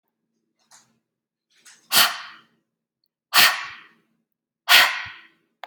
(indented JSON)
{
  "exhalation_length": "5.7 s",
  "exhalation_amplitude": 32326,
  "exhalation_signal_mean_std_ratio": 0.29,
  "survey_phase": "beta (2021-08-13 to 2022-03-07)",
  "age": "45-64",
  "gender": "Female",
  "wearing_mask": "No",
  "symptom_none": true,
  "symptom_onset": "13 days",
  "smoker_status": "Ex-smoker",
  "respiratory_condition_asthma": false,
  "respiratory_condition_other": false,
  "recruitment_source": "REACT",
  "submission_delay": "3 days",
  "covid_test_result": "Negative",
  "covid_test_method": "RT-qPCR",
  "influenza_a_test_result": "Negative",
  "influenza_b_test_result": "Negative"
}